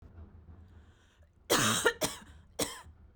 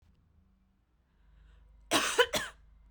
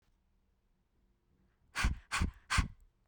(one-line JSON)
{"three_cough_length": "3.2 s", "three_cough_amplitude": 8123, "three_cough_signal_mean_std_ratio": 0.41, "cough_length": "2.9 s", "cough_amplitude": 10105, "cough_signal_mean_std_ratio": 0.31, "exhalation_length": "3.1 s", "exhalation_amplitude": 4379, "exhalation_signal_mean_std_ratio": 0.34, "survey_phase": "beta (2021-08-13 to 2022-03-07)", "age": "18-44", "gender": "Female", "wearing_mask": "No", "symptom_none": true, "smoker_status": "Ex-smoker", "respiratory_condition_asthma": true, "respiratory_condition_other": false, "recruitment_source": "REACT", "submission_delay": "2 days", "covid_test_result": "Negative", "covid_test_method": "RT-qPCR"}